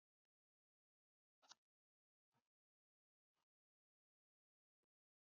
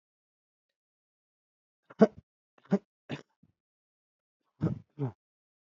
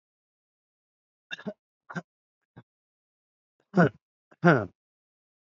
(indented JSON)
{
  "exhalation_length": "5.2 s",
  "exhalation_amplitude": 142,
  "exhalation_signal_mean_std_ratio": 0.09,
  "three_cough_length": "5.7 s",
  "three_cough_amplitude": 16920,
  "three_cough_signal_mean_std_ratio": 0.17,
  "cough_length": "5.5 s",
  "cough_amplitude": 20659,
  "cough_signal_mean_std_ratio": 0.19,
  "survey_phase": "alpha (2021-03-01 to 2021-08-12)",
  "age": "45-64",
  "gender": "Male",
  "wearing_mask": "No",
  "symptom_none": true,
  "smoker_status": "Current smoker (11 or more cigarettes per day)",
  "respiratory_condition_asthma": false,
  "respiratory_condition_other": false,
  "recruitment_source": "REACT",
  "submission_delay": "2 days",
  "covid_test_result": "Negative",
  "covid_test_method": "RT-qPCR"
}